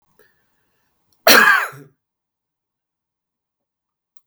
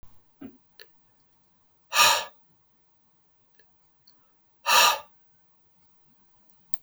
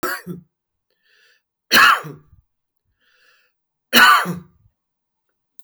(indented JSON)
{
  "cough_length": "4.3 s",
  "cough_amplitude": 32768,
  "cough_signal_mean_std_ratio": 0.24,
  "exhalation_length": "6.8 s",
  "exhalation_amplitude": 32766,
  "exhalation_signal_mean_std_ratio": 0.26,
  "three_cough_length": "5.6 s",
  "three_cough_amplitude": 32766,
  "three_cough_signal_mean_std_ratio": 0.3,
  "survey_phase": "beta (2021-08-13 to 2022-03-07)",
  "age": "45-64",
  "gender": "Male",
  "wearing_mask": "No",
  "symptom_none": true,
  "smoker_status": "Ex-smoker",
  "respiratory_condition_asthma": false,
  "respiratory_condition_other": false,
  "recruitment_source": "REACT",
  "submission_delay": "1 day",
  "covid_test_result": "Negative",
  "covid_test_method": "RT-qPCR",
  "influenza_a_test_result": "Negative",
  "influenza_b_test_result": "Negative"
}